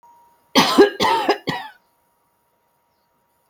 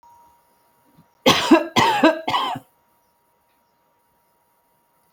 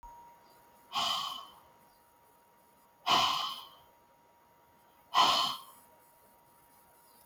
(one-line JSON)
{"cough_length": "3.5 s", "cough_amplitude": 30015, "cough_signal_mean_std_ratio": 0.36, "three_cough_length": "5.1 s", "three_cough_amplitude": 31082, "three_cough_signal_mean_std_ratio": 0.34, "exhalation_length": "7.3 s", "exhalation_amplitude": 7341, "exhalation_signal_mean_std_ratio": 0.37, "survey_phase": "alpha (2021-03-01 to 2021-08-12)", "age": "65+", "gender": "Female", "wearing_mask": "No", "symptom_none": true, "smoker_status": "Never smoked", "respiratory_condition_asthma": false, "respiratory_condition_other": false, "recruitment_source": "REACT", "submission_delay": "2 days", "covid_test_result": "Negative", "covid_test_method": "RT-qPCR"}